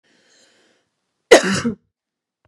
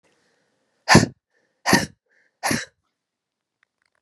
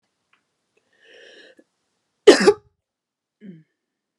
cough_length: 2.5 s
cough_amplitude: 32768
cough_signal_mean_std_ratio: 0.24
exhalation_length: 4.0 s
exhalation_amplitude: 32768
exhalation_signal_mean_std_ratio: 0.25
three_cough_length: 4.2 s
three_cough_amplitude: 32768
three_cough_signal_mean_std_ratio: 0.18
survey_phase: beta (2021-08-13 to 2022-03-07)
age: 45-64
gender: Female
wearing_mask: 'No'
symptom_none: true
smoker_status: Never smoked
respiratory_condition_asthma: false
respiratory_condition_other: false
recruitment_source: REACT
submission_delay: 2 days
covid_test_result: Negative
covid_test_method: RT-qPCR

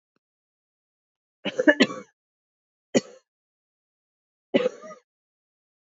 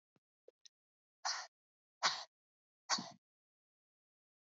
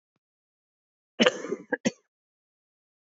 three_cough_length: 5.9 s
three_cough_amplitude: 25202
three_cough_signal_mean_std_ratio: 0.21
exhalation_length: 4.5 s
exhalation_amplitude: 4288
exhalation_signal_mean_std_ratio: 0.24
cough_length: 3.1 s
cough_amplitude: 27195
cough_signal_mean_std_ratio: 0.22
survey_phase: beta (2021-08-13 to 2022-03-07)
age: 18-44
gender: Female
wearing_mask: 'No'
symptom_cough_any: true
symptom_runny_or_blocked_nose: true
symptom_onset: 2 days
smoker_status: Ex-smoker
respiratory_condition_asthma: false
respiratory_condition_other: false
recruitment_source: Test and Trace
submission_delay: 1 day
covid_test_result: Positive
covid_test_method: RT-qPCR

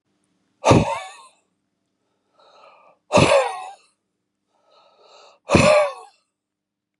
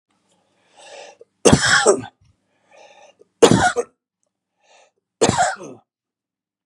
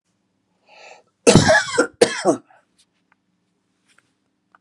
exhalation_length: 7.0 s
exhalation_amplitude: 31525
exhalation_signal_mean_std_ratio: 0.33
three_cough_length: 6.7 s
three_cough_amplitude: 32768
three_cough_signal_mean_std_ratio: 0.32
cough_length: 4.6 s
cough_amplitude: 32768
cough_signal_mean_std_ratio: 0.3
survey_phase: beta (2021-08-13 to 2022-03-07)
age: 45-64
gender: Male
wearing_mask: 'No'
symptom_shortness_of_breath: true
smoker_status: Ex-smoker
respiratory_condition_asthma: true
respiratory_condition_other: false
recruitment_source: REACT
submission_delay: 0 days
covid_test_result: Negative
covid_test_method: RT-qPCR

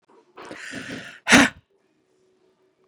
exhalation_length: 2.9 s
exhalation_amplitude: 32767
exhalation_signal_mean_std_ratio: 0.25
survey_phase: beta (2021-08-13 to 2022-03-07)
age: 18-44
gender: Female
wearing_mask: 'No'
symptom_none: true
smoker_status: Ex-smoker
respiratory_condition_asthma: false
respiratory_condition_other: false
recruitment_source: REACT
submission_delay: 3 days
covid_test_result: Negative
covid_test_method: RT-qPCR
influenza_a_test_result: Negative
influenza_b_test_result: Negative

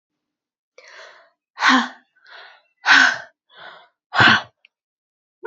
exhalation_length: 5.5 s
exhalation_amplitude: 32768
exhalation_signal_mean_std_ratio: 0.32
survey_phase: beta (2021-08-13 to 2022-03-07)
age: 18-44
gender: Female
wearing_mask: 'No'
symptom_fatigue: true
symptom_headache: true
symptom_onset: 11 days
smoker_status: Never smoked
respiratory_condition_asthma: false
respiratory_condition_other: false
recruitment_source: REACT
submission_delay: 3 days
covid_test_result: Negative
covid_test_method: RT-qPCR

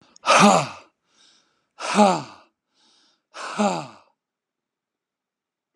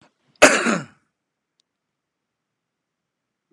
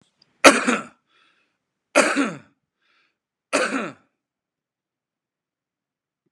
exhalation_length: 5.8 s
exhalation_amplitude: 31508
exhalation_signal_mean_std_ratio: 0.32
cough_length: 3.5 s
cough_amplitude: 32768
cough_signal_mean_std_ratio: 0.21
three_cough_length: 6.3 s
three_cough_amplitude: 32768
three_cough_signal_mean_std_ratio: 0.26
survey_phase: beta (2021-08-13 to 2022-03-07)
age: 65+
gender: Male
wearing_mask: 'No'
symptom_cough_any: true
smoker_status: Never smoked
respiratory_condition_asthma: false
respiratory_condition_other: false
recruitment_source: REACT
submission_delay: 2 days
covid_test_result: Negative
covid_test_method: RT-qPCR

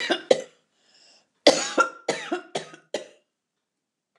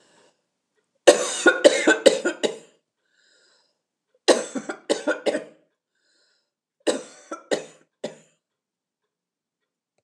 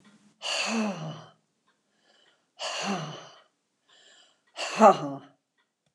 cough_length: 4.2 s
cough_amplitude: 26490
cough_signal_mean_std_ratio: 0.31
three_cough_length: 10.0 s
three_cough_amplitude: 29204
three_cough_signal_mean_std_ratio: 0.29
exhalation_length: 5.9 s
exhalation_amplitude: 20734
exhalation_signal_mean_std_ratio: 0.32
survey_phase: beta (2021-08-13 to 2022-03-07)
age: 65+
gender: Female
wearing_mask: 'No'
symptom_none: true
smoker_status: Never smoked
respiratory_condition_asthma: false
respiratory_condition_other: false
recruitment_source: REACT
submission_delay: 1 day
covid_test_result: Negative
covid_test_method: RT-qPCR
influenza_a_test_result: Negative
influenza_b_test_result: Negative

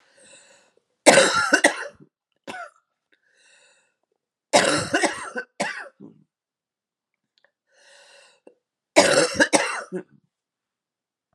three_cough_length: 11.3 s
three_cough_amplitude: 32768
three_cough_signal_mean_std_ratio: 0.32
survey_phase: beta (2021-08-13 to 2022-03-07)
age: 65+
gender: Female
wearing_mask: 'No'
symptom_cough_any: true
symptom_new_continuous_cough: true
symptom_runny_or_blocked_nose: true
symptom_shortness_of_breath: true
symptom_sore_throat: true
symptom_diarrhoea: true
symptom_fatigue: true
symptom_change_to_sense_of_smell_or_taste: true
symptom_loss_of_taste: true
symptom_onset: 6 days
smoker_status: Never smoked
respiratory_condition_asthma: false
respiratory_condition_other: false
recruitment_source: Test and Trace
submission_delay: 2 days
covid_test_result: Positive
covid_test_method: RT-qPCR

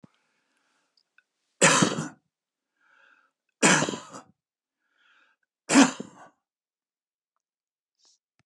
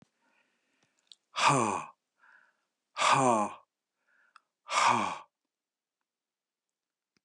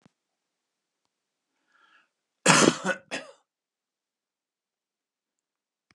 three_cough_length: 8.5 s
three_cough_amplitude: 25228
three_cough_signal_mean_std_ratio: 0.25
exhalation_length: 7.2 s
exhalation_amplitude: 9112
exhalation_signal_mean_std_ratio: 0.34
cough_length: 5.9 s
cough_amplitude: 27199
cough_signal_mean_std_ratio: 0.2
survey_phase: beta (2021-08-13 to 2022-03-07)
age: 65+
gender: Male
wearing_mask: 'No'
symptom_none: true
smoker_status: Never smoked
respiratory_condition_asthma: false
respiratory_condition_other: false
recruitment_source: REACT
submission_delay: 1 day
covid_test_result: Negative
covid_test_method: RT-qPCR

